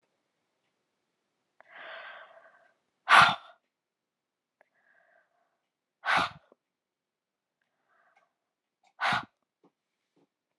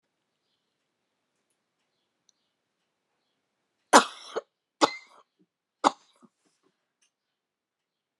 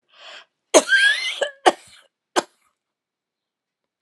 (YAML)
exhalation_length: 10.6 s
exhalation_amplitude: 16293
exhalation_signal_mean_std_ratio: 0.19
three_cough_length: 8.2 s
three_cough_amplitude: 30862
three_cough_signal_mean_std_ratio: 0.13
cough_length: 4.0 s
cough_amplitude: 32572
cough_signal_mean_std_ratio: 0.31
survey_phase: alpha (2021-03-01 to 2021-08-12)
age: 65+
gender: Female
wearing_mask: 'No'
symptom_none: true
smoker_status: Never smoked
respiratory_condition_asthma: false
respiratory_condition_other: false
recruitment_source: REACT
submission_delay: 4 days
covid_test_result: Negative
covid_test_method: RT-qPCR